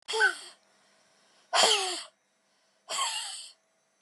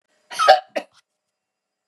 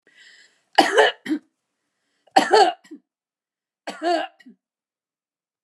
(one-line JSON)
{"exhalation_length": "4.0 s", "exhalation_amplitude": 14204, "exhalation_signal_mean_std_ratio": 0.42, "cough_length": "1.9 s", "cough_amplitude": 32679, "cough_signal_mean_std_ratio": 0.27, "three_cough_length": "5.6 s", "three_cough_amplitude": 31284, "three_cough_signal_mean_std_ratio": 0.32, "survey_phase": "beta (2021-08-13 to 2022-03-07)", "age": "65+", "gender": "Female", "wearing_mask": "No", "symptom_none": true, "smoker_status": "Never smoked", "respiratory_condition_asthma": false, "respiratory_condition_other": false, "recruitment_source": "REACT", "submission_delay": "3 days", "covid_test_result": "Negative", "covid_test_method": "RT-qPCR", "influenza_a_test_result": "Negative", "influenza_b_test_result": "Negative"}